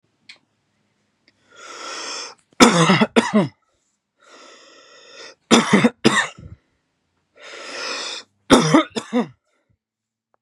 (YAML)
three_cough_length: 10.4 s
three_cough_amplitude: 32768
three_cough_signal_mean_std_ratio: 0.35
survey_phase: beta (2021-08-13 to 2022-03-07)
age: 18-44
gender: Male
wearing_mask: 'No'
symptom_none: true
smoker_status: Never smoked
respiratory_condition_asthma: false
respiratory_condition_other: false
recruitment_source: REACT
submission_delay: 10 days
covid_test_result: Negative
covid_test_method: RT-qPCR
influenza_a_test_result: Negative
influenza_b_test_result: Negative